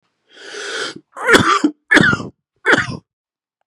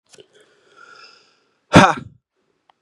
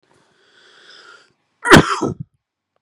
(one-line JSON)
{"three_cough_length": "3.7 s", "three_cough_amplitude": 32768, "three_cough_signal_mean_std_ratio": 0.45, "exhalation_length": "2.8 s", "exhalation_amplitude": 32768, "exhalation_signal_mean_std_ratio": 0.21, "cough_length": "2.8 s", "cough_amplitude": 32768, "cough_signal_mean_std_ratio": 0.26, "survey_phase": "beta (2021-08-13 to 2022-03-07)", "age": "18-44", "gender": "Male", "wearing_mask": "No", "symptom_cough_any": true, "symptom_new_continuous_cough": true, "symptom_runny_or_blocked_nose": true, "symptom_fatigue": true, "symptom_change_to_sense_of_smell_or_taste": true, "symptom_loss_of_taste": true, "symptom_onset": "3 days", "smoker_status": "Never smoked", "respiratory_condition_asthma": false, "respiratory_condition_other": false, "recruitment_source": "Test and Trace", "submission_delay": "2 days", "covid_test_result": "Positive", "covid_test_method": "RT-qPCR", "covid_ct_value": 20.8, "covid_ct_gene": "ORF1ab gene"}